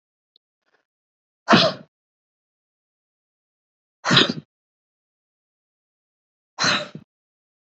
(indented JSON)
{
  "exhalation_length": "7.7 s",
  "exhalation_amplitude": 30445,
  "exhalation_signal_mean_std_ratio": 0.23,
  "survey_phase": "beta (2021-08-13 to 2022-03-07)",
  "age": "45-64",
  "gender": "Female",
  "wearing_mask": "No",
  "symptom_none": true,
  "smoker_status": "Never smoked",
  "respiratory_condition_asthma": false,
  "respiratory_condition_other": false,
  "recruitment_source": "REACT",
  "submission_delay": "2 days",
  "covid_test_result": "Negative",
  "covid_test_method": "RT-qPCR",
  "influenza_a_test_result": "Negative",
  "influenza_b_test_result": "Negative"
}